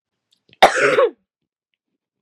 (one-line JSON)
{"cough_length": "2.2 s", "cough_amplitude": 32768, "cough_signal_mean_std_ratio": 0.34, "survey_phase": "beta (2021-08-13 to 2022-03-07)", "age": "18-44", "gender": "Female", "wearing_mask": "No", "symptom_cough_any": true, "symptom_new_continuous_cough": true, "symptom_runny_or_blocked_nose": true, "symptom_change_to_sense_of_smell_or_taste": true, "symptom_loss_of_taste": true, "symptom_other": true, "symptom_onset": "2 days", "smoker_status": "Never smoked", "respiratory_condition_asthma": false, "respiratory_condition_other": false, "recruitment_source": "Test and Trace", "submission_delay": "2 days", "covid_test_result": "Positive", "covid_test_method": "RT-qPCR", "covid_ct_value": 16.2, "covid_ct_gene": "ORF1ab gene", "covid_ct_mean": 16.6, "covid_viral_load": "3600000 copies/ml", "covid_viral_load_category": "High viral load (>1M copies/ml)"}